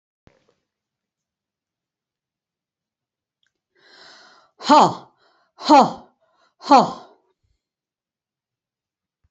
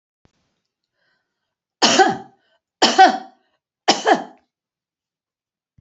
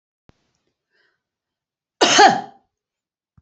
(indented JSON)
{
  "exhalation_length": "9.3 s",
  "exhalation_amplitude": 29215,
  "exhalation_signal_mean_std_ratio": 0.21,
  "three_cough_length": "5.8 s",
  "three_cough_amplitude": 32767,
  "three_cough_signal_mean_std_ratio": 0.3,
  "cough_length": "3.4 s",
  "cough_amplitude": 29434,
  "cough_signal_mean_std_ratio": 0.26,
  "survey_phase": "beta (2021-08-13 to 2022-03-07)",
  "age": "65+",
  "gender": "Female",
  "wearing_mask": "No",
  "symptom_none": true,
  "smoker_status": "Never smoked",
  "respiratory_condition_asthma": false,
  "respiratory_condition_other": false,
  "recruitment_source": "REACT",
  "submission_delay": "7 days",
  "covid_test_result": "Negative",
  "covid_test_method": "RT-qPCR"
}